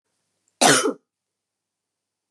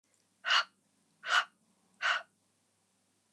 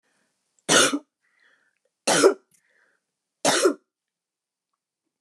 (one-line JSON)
{"cough_length": "2.3 s", "cough_amplitude": 29916, "cough_signal_mean_std_ratio": 0.28, "exhalation_length": "3.3 s", "exhalation_amplitude": 7000, "exhalation_signal_mean_std_ratio": 0.32, "three_cough_length": "5.2 s", "three_cough_amplitude": 21922, "three_cough_signal_mean_std_ratio": 0.31, "survey_phase": "beta (2021-08-13 to 2022-03-07)", "age": "45-64", "gender": "Female", "wearing_mask": "No", "symptom_runny_or_blocked_nose": true, "smoker_status": "Never smoked", "respiratory_condition_asthma": false, "respiratory_condition_other": false, "recruitment_source": "REACT", "submission_delay": "2 days", "covid_test_result": "Negative", "covid_test_method": "RT-qPCR", "influenza_a_test_result": "Negative", "influenza_b_test_result": "Negative"}